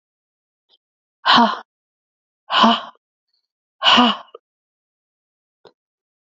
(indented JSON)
{
  "exhalation_length": "6.2 s",
  "exhalation_amplitude": 32767,
  "exhalation_signal_mean_std_ratio": 0.3,
  "survey_phase": "beta (2021-08-13 to 2022-03-07)",
  "age": "45-64",
  "gender": "Female",
  "wearing_mask": "No",
  "symptom_runny_or_blocked_nose": true,
  "symptom_shortness_of_breath": true,
  "symptom_fatigue": true,
  "smoker_status": "Never smoked",
  "respiratory_condition_asthma": true,
  "respiratory_condition_other": false,
  "recruitment_source": "REACT",
  "submission_delay": "3 days",
  "covid_test_result": "Negative",
  "covid_test_method": "RT-qPCR",
  "influenza_a_test_result": "Negative",
  "influenza_b_test_result": "Negative"
}